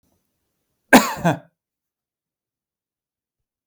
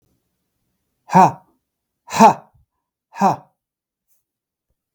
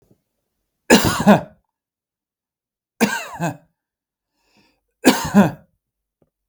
cough_length: 3.7 s
cough_amplitude: 32768
cough_signal_mean_std_ratio: 0.2
exhalation_length: 4.9 s
exhalation_amplitude: 32768
exhalation_signal_mean_std_ratio: 0.25
three_cough_length: 6.5 s
three_cough_amplitude: 32768
three_cough_signal_mean_std_ratio: 0.31
survey_phase: beta (2021-08-13 to 2022-03-07)
age: 45-64
gender: Male
wearing_mask: 'No'
symptom_none: true
smoker_status: Never smoked
respiratory_condition_asthma: false
respiratory_condition_other: false
recruitment_source: REACT
submission_delay: 3 days
covid_test_result: Negative
covid_test_method: RT-qPCR
influenza_a_test_result: Negative
influenza_b_test_result: Negative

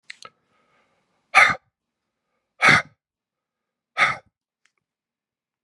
exhalation_length: 5.6 s
exhalation_amplitude: 30733
exhalation_signal_mean_std_ratio: 0.24
survey_phase: beta (2021-08-13 to 2022-03-07)
age: 45-64
gender: Male
wearing_mask: 'No'
symptom_cough_any: true
symptom_new_continuous_cough: true
symptom_sore_throat: true
symptom_fatigue: true
smoker_status: Never smoked
respiratory_condition_asthma: false
respiratory_condition_other: false
recruitment_source: Test and Trace
submission_delay: 2 days
covid_test_result: Positive
covid_test_method: LFT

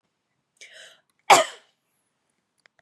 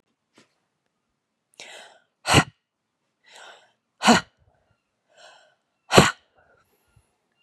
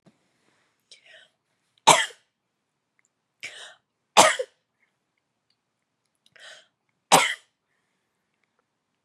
cough_length: 2.8 s
cough_amplitude: 31961
cough_signal_mean_std_ratio: 0.18
exhalation_length: 7.4 s
exhalation_amplitude: 32768
exhalation_signal_mean_std_ratio: 0.2
three_cough_length: 9.0 s
three_cough_amplitude: 32321
three_cough_signal_mean_std_ratio: 0.19
survey_phase: beta (2021-08-13 to 2022-03-07)
age: 45-64
gender: Female
wearing_mask: 'No'
symptom_runny_or_blocked_nose: true
smoker_status: Never smoked
respiratory_condition_asthma: false
respiratory_condition_other: false
recruitment_source: Test and Trace
submission_delay: 1 day
covid_test_result: Positive
covid_test_method: RT-qPCR
covid_ct_value: 18.9
covid_ct_gene: ORF1ab gene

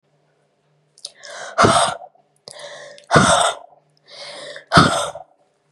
exhalation_length: 5.7 s
exhalation_amplitude: 32768
exhalation_signal_mean_std_ratio: 0.39
survey_phase: beta (2021-08-13 to 2022-03-07)
age: 18-44
gender: Female
wearing_mask: 'No'
symptom_cough_any: true
symptom_runny_or_blocked_nose: true
symptom_shortness_of_breath: true
symptom_sore_throat: true
symptom_diarrhoea: true
symptom_headache: true
symptom_onset: 4 days
smoker_status: Ex-smoker
respiratory_condition_asthma: false
respiratory_condition_other: false
recruitment_source: Test and Trace
submission_delay: 2 days
covid_test_method: ePCR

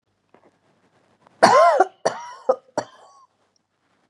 three_cough_length: 4.1 s
three_cough_amplitude: 32767
three_cough_signal_mean_std_ratio: 0.31
survey_phase: beta (2021-08-13 to 2022-03-07)
age: 45-64
gender: Female
wearing_mask: 'No'
symptom_none: true
smoker_status: Never smoked
respiratory_condition_asthma: false
respiratory_condition_other: false
recruitment_source: REACT
submission_delay: 1 day
covid_test_result: Negative
covid_test_method: RT-qPCR
influenza_a_test_result: Unknown/Void
influenza_b_test_result: Unknown/Void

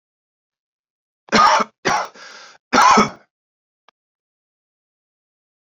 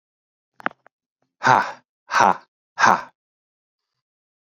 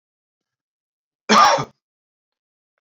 three_cough_length: 5.7 s
three_cough_amplitude: 29492
three_cough_signal_mean_std_ratio: 0.32
exhalation_length: 4.4 s
exhalation_amplitude: 32126
exhalation_signal_mean_std_ratio: 0.28
cough_length: 2.8 s
cough_amplitude: 28105
cough_signal_mean_std_ratio: 0.27
survey_phase: alpha (2021-03-01 to 2021-08-12)
age: 18-44
gender: Male
wearing_mask: 'No'
symptom_cough_any: true
symptom_shortness_of_breath: true
symptom_abdominal_pain: true
symptom_fatigue: true
symptom_fever_high_temperature: true
symptom_headache: true
smoker_status: Never smoked
respiratory_condition_asthma: false
respiratory_condition_other: false
recruitment_source: Test and Trace
submission_delay: 1 day
covid_test_result: Positive
covid_test_method: RT-qPCR
covid_ct_value: 19.2
covid_ct_gene: ORF1ab gene
covid_ct_mean: 19.7
covid_viral_load: 340000 copies/ml
covid_viral_load_category: Low viral load (10K-1M copies/ml)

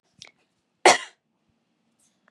cough_length: 2.3 s
cough_amplitude: 29545
cough_signal_mean_std_ratio: 0.18
survey_phase: beta (2021-08-13 to 2022-03-07)
age: 18-44
gender: Female
wearing_mask: 'No'
symptom_none: true
smoker_status: Never smoked
respiratory_condition_asthma: false
respiratory_condition_other: false
recruitment_source: REACT
submission_delay: 1 day
covid_test_result: Negative
covid_test_method: RT-qPCR
influenza_a_test_result: Negative
influenza_b_test_result: Negative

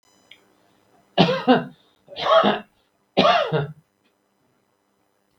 three_cough_length: 5.4 s
three_cough_amplitude: 32767
three_cough_signal_mean_std_ratio: 0.38
survey_phase: beta (2021-08-13 to 2022-03-07)
age: 65+
gender: Male
wearing_mask: 'No'
symptom_none: true
smoker_status: Ex-smoker
respiratory_condition_asthma: false
respiratory_condition_other: false
recruitment_source: REACT
submission_delay: 3 days
covid_test_result: Negative
covid_test_method: RT-qPCR
influenza_a_test_result: Negative
influenza_b_test_result: Negative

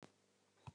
three_cough_length: 0.7 s
three_cough_amplitude: 319
three_cough_signal_mean_std_ratio: 0.38
survey_phase: beta (2021-08-13 to 2022-03-07)
age: 65+
gender: Female
wearing_mask: 'No'
symptom_none: true
smoker_status: Never smoked
respiratory_condition_asthma: false
respiratory_condition_other: false
recruitment_source: REACT
submission_delay: 1 day
covid_test_result: Negative
covid_test_method: RT-qPCR
influenza_a_test_result: Negative
influenza_b_test_result: Negative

